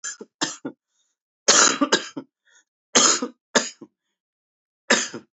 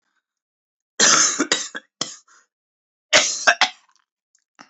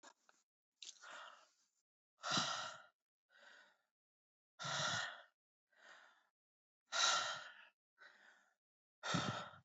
{"three_cough_length": "5.4 s", "three_cough_amplitude": 28252, "three_cough_signal_mean_std_ratio": 0.36, "cough_length": "4.7 s", "cough_amplitude": 32475, "cough_signal_mean_std_ratio": 0.35, "exhalation_length": "9.6 s", "exhalation_amplitude": 2548, "exhalation_signal_mean_std_ratio": 0.38, "survey_phase": "beta (2021-08-13 to 2022-03-07)", "age": "18-44", "gender": "Male", "wearing_mask": "No", "symptom_cough_any": true, "symptom_runny_or_blocked_nose": true, "symptom_other": true, "symptom_onset": "10 days", "smoker_status": "Never smoked", "respiratory_condition_asthma": false, "respiratory_condition_other": false, "recruitment_source": "Test and Trace", "submission_delay": "2 days", "covid_test_result": "Positive", "covid_test_method": "RT-qPCR"}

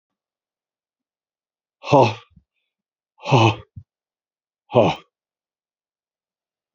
{"exhalation_length": "6.7 s", "exhalation_amplitude": 27437, "exhalation_signal_mean_std_ratio": 0.25, "survey_phase": "beta (2021-08-13 to 2022-03-07)", "age": "65+", "gender": "Male", "wearing_mask": "No", "symptom_cough_any": true, "symptom_runny_or_blocked_nose": true, "symptom_fatigue": true, "symptom_change_to_sense_of_smell_or_taste": true, "symptom_onset": "4 days", "smoker_status": "Never smoked", "respiratory_condition_asthma": false, "respiratory_condition_other": true, "recruitment_source": "Test and Trace", "submission_delay": "2 days", "covid_test_result": "Positive", "covid_test_method": "RT-qPCR", "covid_ct_value": 24.6, "covid_ct_gene": "N gene"}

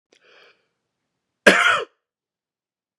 {"cough_length": "3.0 s", "cough_amplitude": 32768, "cough_signal_mean_std_ratio": 0.25, "survey_phase": "beta (2021-08-13 to 2022-03-07)", "age": "18-44", "gender": "Male", "wearing_mask": "No", "symptom_none": true, "smoker_status": "Never smoked", "respiratory_condition_asthma": false, "respiratory_condition_other": false, "recruitment_source": "REACT", "submission_delay": "3 days", "covid_test_result": "Negative", "covid_test_method": "RT-qPCR", "influenza_a_test_result": "Negative", "influenza_b_test_result": "Negative"}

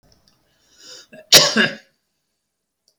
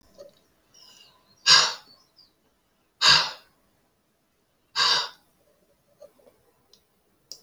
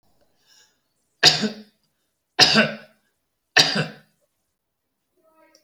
{"cough_length": "3.0 s", "cough_amplitude": 32768, "cough_signal_mean_std_ratio": 0.26, "exhalation_length": "7.4 s", "exhalation_amplitude": 26000, "exhalation_signal_mean_std_ratio": 0.26, "three_cough_length": "5.6 s", "three_cough_amplitude": 32768, "three_cough_signal_mean_std_ratio": 0.28, "survey_phase": "alpha (2021-03-01 to 2021-08-12)", "age": "65+", "gender": "Male", "wearing_mask": "No", "symptom_none": true, "smoker_status": "Ex-smoker", "respiratory_condition_asthma": false, "respiratory_condition_other": false, "recruitment_source": "REACT", "submission_delay": "2 days", "covid_test_result": "Negative", "covid_test_method": "RT-qPCR"}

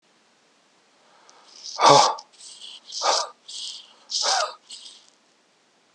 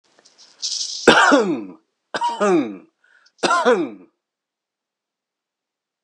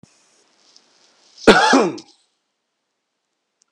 {"exhalation_length": "5.9 s", "exhalation_amplitude": 29246, "exhalation_signal_mean_std_ratio": 0.34, "three_cough_length": "6.0 s", "three_cough_amplitude": 32768, "three_cough_signal_mean_std_ratio": 0.43, "cough_length": "3.7 s", "cough_amplitude": 32768, "cough_signal_mean_std_ratio": 0.27, "survey_phase": "beta (2021-08-13 to 2022-03-07)", "age": "45-64", "gender": "Male", "wearing_mask": "No", "symptom_runny_or_blocked_nose": true, "smoker_status": "Never smoked", "respiratory_condition_asthma": false, "respiratory_condition_other": false, "recruitment_source": "REACT", "submission_delay": "2 days", "covid_test_result": "Negative", "covid_test_method": "RT-qPCR"}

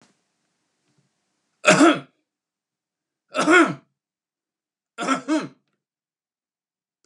{"three_cough_length": "7.1 s", "three_cough_amplitude": 31855, "three_cough_signal_mean_std_ratio": 0.28, "survey_phase": "beta (2021-08-13 to 2022-03-07)", "age": "65+", "gender": "Male", "wearing_mask": "No", "symptom_none": true, "smoker_status": "Never smoked", "respiratory_condition_asthma": false, "respiratory_condition_other": false, "recruitment_source": "REACT", "submission_delay": "2 days", "covid_test_result": "Negative", "covid_test_method": "RT-qPCR", "influenza_a_test_result": "Negative", "influenza_b_test_result": "Negative"}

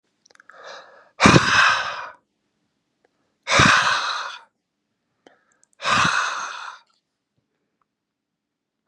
{"exhalation_length": "8.9 s", "exhalation_amplitude": 32719, "exhalation_signal_mean_std_ratio": 0.38, "survey_phase": "beta (2021-08-13 to 2022-03-07)", "age": "18-44", "gender": "Male", "wearing_mask": "No", "symptom_none": true, "smoker_status": "Never smoked", "respiratory_condition_asthma": false, "respiratory_condition_other": true, "recruitment_source": "REACT", "submission_delay": "0 days", "covid_test_result": "Negative", "covid_test_method": "RT-qPCR", "influenza_a_test_result": "Negative", "influenza_b_test_result": "Negative"}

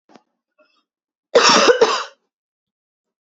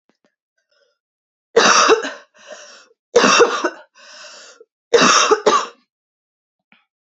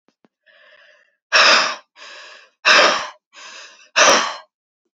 {"cough_length": "3.3 s", "cough_amplitude": 28195, "cough_signal_mean_std_ratio": 0.35, "three_cough_length": "7.2 s", "three_cough_amplitude": 32334, "three_cough_signal_mean_std_ratio": 0.4, "exhalation_length": "4.9 s", "exhalation_amplitude": 32767, "exhalation_signal_mean_std_ratio": 0.4, "survey_phase": "beta (2021-08-13 to 2022-03-07)", "age": "18-44", "gender": "Female", "wearing_mask": "No", "symptom_cough_any": true, "symptom_new_continuous_cough": true, "symptom_runny_or_blocked_nose": true, "symptom_sore_throat": true, "symptom_fatigue": true, "symptom_headache": true, "symptom_change_to_sense_of_smell_or_taste": true, "symptom_onset": "2 days", "smoker_status": "Never smoked", "respiratory_condition_asthma": true, "respiratory_condition_other": false, "recruitment_source": "Test and Trace", "submission_delay": "2 days", "covid_test_result": "Positive", "covid_test_method": "RT-qPCR"}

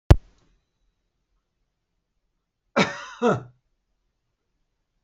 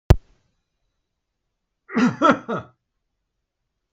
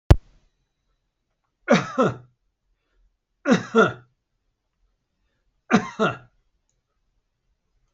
{"cough_length": "5.0 s", "cough_amplitude": 32766, "cough_signal_mean_std_ratio": 0.18, "exhalation_length": "3.9 s", "exhalation_amplitude": 32766, "exhalation_signal_mean_std_ratio": 0.26, "three_cough_length": "7.9 s", "three_cough_amplitude": 32766, "three_cough_signal_mean_std_ratio": 0.25, "survey_phase": "beta (2021-08-13 to 2022-03-07)", "age": "65+", "gender": "Male", "wearing_mask": "No", "symptom_none": true, "smoker_status": "Ex-smoker", "respiratory_condition_asthma": false, "respiratory_condition_other": false, "recruitment_source": "REACT", "submission_delay": "0 days", "covid_test_result": "Negative", "covid_test_method": "RT-qPCR"}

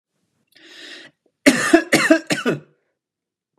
{"cough_length": "3.6 s", "cough_amplitude": 32768, "cough_signal_mean_std_ratio": 0.35, "survey_phase": "beta (2021-08-13 to 2022-03-07)", "age": "18-44", "gender": "Male", "wearing_mask": "No", "symptom_none": true, "smoker_status": "Never smoked", "respiratory_condition_asthma": false, "respiratory_condition_other": false, "recruitment_source": "REACT", "submission_delay": "1 day", "covid_test_result": "Negative", "covid_test_method": "RT-qPCR", "influenza_a_test_result": "Negative", "influenza_b_test_result": "Negative"}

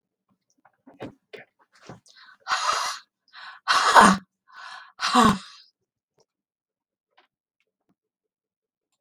{"exhalation_length": "9.0 s", "exhalation_amplitude": 32768, "exhalation_signal_mean_std_ratio": 0.28, "survey_phase": "beta (2021-08-13 to 2022-03-07)", "age": "65+", "gender": "Female", "wearing_mask": "No", "symptom_cough_any": true, "smoker_status": "Ex-smoker", "respiratory_condition_asthma": true, "respiratory_condition_other": false, "recruitment_source": "REACT", "submission_delay": "1 day", "covid_test_result": "Negative", "covid_test_method": "RT-qPCR", "influenza_a_test_result": "Negative", "influenza_b_test_result": "Negative"}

